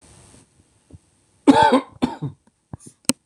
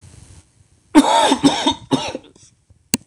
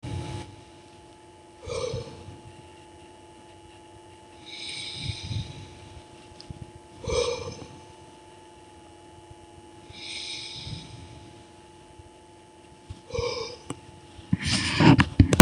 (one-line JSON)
{"cough_length": "3.3 s", "cough_amplitude": 26028, "cough_signal_mean_std_ratio": 0.31, "three_cough_length": "3.1 s", "three_cough_amplitude": 26028, "three_cough_signal_mean_std_ratio": 0.43, "exhalation_length": "15.4 s", "exhalation_amplitude": 26028, "exhalation_signal_mean_std_ratio": 0.3, "survey_phase": "beta (2021-08-13 to 2022-03-07)", "age": "45-64", "gender": "Male", "wearing_mask": "No", "symptom_none": true, "smoker_status": "Ex-smoker", "respiratory_condition_asthma": false, "respiratory_condition_other": false, "recruitment_source": "REACT", "submission_delay": "1 day", "covid_test_result": "Negative", "covid_test_method": "RT-qPCR", "influenza_a_test_result": "Negative", "influenza_b_test_result": "Negative"}